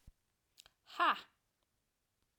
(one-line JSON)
{"exhalation_length": "2.4 s", "exhalation_amplitude": 3434, "exhalation_signal_mean_std_ratio": 0.23, "survey_phase": "alpha (2021-03-01 to 2021-08-12)", "age": "45-64", "gender": "Female", "wearing_mask": "No", "symptom_none": true, "smoker_status": "Never smoked", "respiratory_condition_asthma": false, "respiratory_condition_other": false, "recruitment_source": "REACT", "submission_delay": "4 days", "covid_test_result": "Negative", "covid_test_method": "RT-qPCR"}